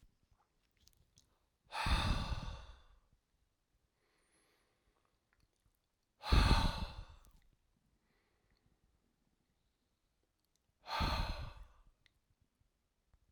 {"exhalation_length": "13.3 s", "exhalation_amplitude": 4567, "exhalation_signal_mean_std_ratio": 0.3, "survey_phase": "alpha (2021-03-01 to 2021-08-12)", "age": "65+", "gender": "Male", "wearing_mask": "No", "symptom_none": true, "smoker_status": "Never smoked", "respiratory_condition_asthma": false, "respiratory_condition_other": false, "recruitment_source": "REACT", "submission_delay": "3 days", "covid_test_result": "Negative", "covid_test_method": "RT-qPCR"}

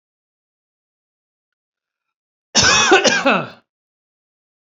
{"cough_length": "4.7 s", "cough_amplitude": 32767, "cough_signal_mean_std_ratio": 0.34, "survey_phase": "beta (2021-08-13 to 2022-03-07)", "age": "45-64", "gender": "Female", "wearing_mask": "No", "symptom_runny_or_blocked_nose": true, "symptom_headache": true, "symptom_change_to_sense_of_smell_or_taste": true, "symptom_loss_of_taste": true, "symptom_onset": "4 days", "smoker_status": "Never smoked", "respiratory_condition_asthma": false, "respiratory_condition_other": false, "recruitment_source": "Test and Trace", "submission_delay": "1 day", "covid_test_result": "Positive", "covid_test_method": "RT-qPCR"}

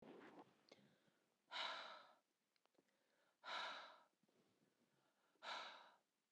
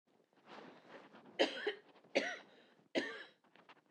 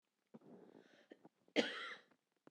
{"exhalation_length": "6.3 s", "exhalation_amplitude": 616, "exhalation_signal_mean_std_ratio": 0.44, "three_cough_length": "3.9 s", "three_cough_amplitude": 4512, "three_cough_signal_mean_std_ratio": 0.37, "cough_length": "2.5 s", "cough_amplitude": 3492, "cough_signal_mean_std_ratio": 0.29, "survey_phase": "beta (2021-08-13 to 2022-03-07)", "age": "45-64", "gender": "Female", "wearing_mask": "No", "symptom_cough_any": true, "symptom_fatigue": true, "symptom_headache": true, "symptom_change_to_sense_of_smell_or_taste": true, "symptom_other": true, "smoker_status": "Never smoked", "respiratory_condition_asthma": false, "respiratory_condition_other": false, "recruitment_source": "Test and Trace", "submission_delay": "2 days", "covid_test_result": "Positive", "covid_test_method": "RT-qPCR", "covid_ct_value": 15.1, "covid_ct_gene": "ORF1ab gene", "covid_ct_mean": 16.1, "covid_viral_load": "5100000 copies/ml", "covid_viral_load_category": "High viral load (>1M copies/ml)"}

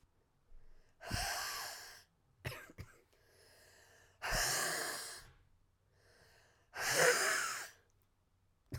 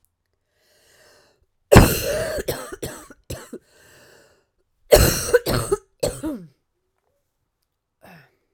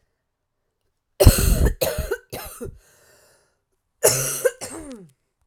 {"exhalation_length": "8.8 s", "exhalation_amplitude": 5578, "exhalation_signal_mean_std_ratio": 0.45, "cough_length": "8.5 s", "cough_amplitude": 32768, "cough_signal_mean_std_ratio": 0.3, "three_cough_length": "5.5 s", "three_cough_amplitude": 32768, "three_cough_signal_mean_std_ratio": 0.36, "survey_phase": "alpha (2021-03-01 to 2021-08-12)", "age": "18-44", "gender": "Female", "wearing_mask": "No", "symptom_cough_any": true, "symptom_fatigue": true, "symptom_fever_high_temperature": true, "symptom_headache": true, "symptom_change_to_sense_of_smell_or_taste": true, "symptom_loss_of_taste": true, "symptom_onset": "4 days", "smoker_status": "Ex-smoker", "respiratory_condition_asthma": false, "respiratory_condition_other": false, "recruitment_source": "Test and Trace", "submission_delay": "4 days", "covid_test_result": "Positive", "covid_test_method": "RT-qPCR"}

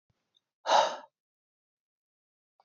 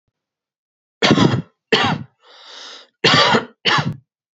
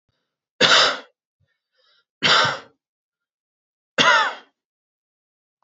{"exhalation_length": "2.6 s", "exhalation_amplitude": 9240, "exhalation_signal_mean_std_ratio": 0.24, "cough_length": "4.4 s", "cough_amplitude": 30805, "cough_signal_mean_std_ratio": 0.46, "three_cough_length": "5.6 s", "three_cough_amplitude": 29159, "three_cough_signal_mean_std_ratio": 0.34, "survey_phase": "beta (2021-08-13 to 2022-03-07)", "age": "18-44", "gender": "Male", "wearing_mask": "No", "symptom_cough_any": true, "symptom_headache": true, "symptom_loss_of_taste": true, "symptom_onset": "7 days", "smoker_status": "Never smoked", "respiratory_condition_asthma": false, "respiratory_condition_other": false, "recruitment_source": "Test and Trace", "submission_delay": "4 days", "covid_test_result": "Negative", "covid_test_method": "RT-qPCR"}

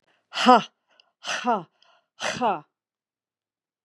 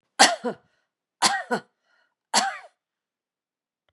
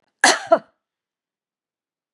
{"exhalation_length": "3.8 s", "exhalation_amplitude": 29963, "exhalation_signal_mean_std_ratio": 0.3, "three_cough_length": "3.9 s", "three_cough_amplitude": 31719, "three_cough_signal_mean_std_ratio": 0.3, "cough_length": "2.1 s", "cough_amplitude": 31984, "cough_signal_mean_std_ratio": 0.24, "survey_phase": "beta (2021-08-13 to 2022-03-07)", "age": "65+", "gender": "Female", "wearing_mask": "No", "symptom_cough_any": true, "symptom_runny_or_blocked_nose": true, "symptom_onset": "4 days", "smoker_status": "Never smoked", "respiratory_condition_asthma": false, "respiratory_condition_other": false, "recruitment_source": "Test and Trace", "submission_delay": "1 day", "covid_test_result": "Positive", "covid_test_method": "RT-qPCR", "covid_ct_value": 26.9, "covid_ct_gene": "ORF1ab gene"}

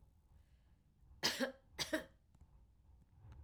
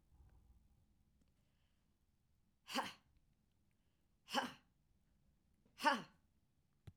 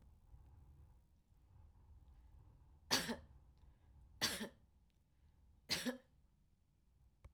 {"cough_length": "3.4 s", "cough_amplitude": 2648, "cough_signal_mean_std_ratio": 0.36, "exhalation_length": "7.0 s", "exhalation_amplitude": 2693, "exhalation_signal_mean_std_ratio": 0.23, "three_cough_length": "7.3 s", "three_cough_amplitude": 3259, "three_cough_signal_mean_std_ratio": 0.34, "survey_phase": "beta (2021-08-13 to 2022-03-07)", "age": "65+", "gender": "Female", "wearing_mask": "No", "symptom_none": true, "smoker_status": "Never smoked", "respiratory_condition_asthma": false, "respiratory_condition_other": false, "recruitment_source": "REACT", "submission_delay": "2 days", "covid_test_result": "Negative", "covid_test_method": "RT-qPCR", "influenza_a_test_result": "Negative", "influenza_b_test_result": "Negative"}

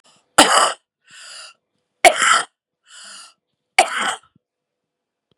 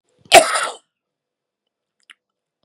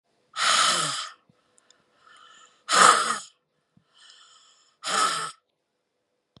{"three_cough_length": "5.4 s", "three_cough_amplitude": 32768, "three_cough_signal_mean_std_ratio": 0.32, "cough_length": "2.6 s", "cough_amplitude": 32768, "cough_signal_mean_std_ratio": 0.23, "exhalation_length": "6.4 s", "exhalation_amplitude": 29815, "exhalation_signal_mean_std_ratio": 0.37, "survey_phase": "beta (2021-08-13 to 2022-03-07)", "age": "65+", "gender": "Female", "wearing_mask": "No", "symptom_none": true, "smoker_status": "Current smoker (11 or more cigarettes per day)", "respiratory_condition_asthma": false, "respiratory_condition_other": true, "recruitment_source": "REACT", "submission_delay": "1 day", "covid_test_result": "Negative", "covid_test_method": "RT-qPCR", "influenza_a_test_result": "Negative", "influenza_b_test_result": "Negative"}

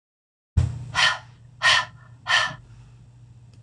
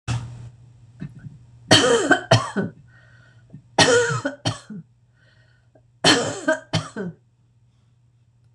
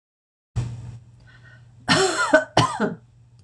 {"exhalation_length": "3.6 s", "exhalation_amplitude": 17724, "exhalation_signal_mean_std_ratio": 0.43, "three_cough_length": "8.5 s", "three_cough_amplitude": 26028, "three_cough_signal_mean_std_ratio": 0.41, "cough_length": "3.4 s", "cough_amplitude": 26028, "cough_signal_mean_std_ratio": 0.45, "survey_phase": "beta (2021-08-13 to 2022-03-07)", "age": "65+", "gender": "Female", "wearing_mask": "No", "symptom_none": true, "smoker_status": "Never smoked", "respiratory_condition_asthma": false, "respiratory_condition_other": false, "recruitment_source": "REACT", "submission_delay": "1 day", "covid_test_result": "Negative", "covid_test_method": "RT-qPCR"}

